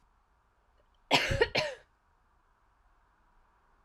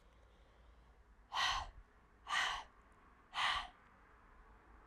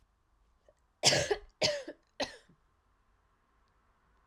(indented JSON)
{
  "cough_length": "3.8 s",
  "cough_amplitude": 10600,
  "cough_signal_mean_std_ratio": 0.28,
  "exhalation_length": "4.9 s",
  "exhalation_amplitude": 2188,
  "exhalation_signal_mean_std_ratio": 0.44,
  "three_cough_length": "4.3 s",
  "three_cough_amplitude": 9637,
  "three_cough_signal_mean_std_ratio": 0.29,
  "survey_phase": "alpha (2021-03-01 to 2021-08-12)",
  "age": "18-44",
  "gender": "Female",
  "wearing_mask": "No",
  "symptom_cough_any": true,
  "symptom_shortness_of_breath": true,
  "symptom_abdominal_pain": true,
  "symptom_fatigue": true,
  "symptom_fever_high_temperature": true,
  "symptom_headache": true,
  "symptom_onset": "3 days",
  "smoker_status": "Never smoked",
  "respiratory_condition_asthma": false,
  "respiratory_condition_other": false,
  "recruitment_source": "Test and Trace",
  "submission_delay": "2 days",
  "covid_test_result": "Positive",
  "covid_test_method": "RT-qPCR"
}